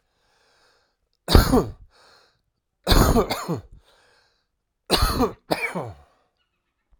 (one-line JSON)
{"three_cough_length": "7.0 s", "three_cough_amplitude": 32768, "three_cough_signal_mean_std_ratio": 0.36, "survey_phase": "alpha (2021-03-01 to 2021-08-12)", "age": "45-64", "gender": "Male", "wearing_mask": "No", "symptom_cough_any": true, "symptom_shortness_of_breath": true, "symptom_fatigue": true, "symptom_headache": true, "symptom_onset": "5 days", "smoker_status": "Ex-smoker", "respiratory_condition_asthma": false, "respiratory_condition_other": false, "recruitment_source": "Test and Trace", "submission_delay": "2 days", "covid_test_result": "Positive", "covid_test_method": "RT-qPCR", "covid_ct_value": 24.6, "covid_ct_gene": "ORF1ab gene"}